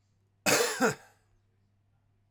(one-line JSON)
{"cough_length": "2.3 s", "cough_amplitude": 8998, "cough_signal_mean_std_ratio": 0.36, "survey_phase": "alpha (2021-03-01 to 2021-08-12)", "age": "45-64", "gender": "Male", "wearing_mask": "No", "symptom_none": true, "smoker_status": "Never smoked", "respiratory_condition_asthma": false, "respiratory_condition_other": false, "recruitment_source": "REACT", "submission_delay": "1 day", "covid_test_result": "Negative", "covid_test_method": "RT-qPCR"}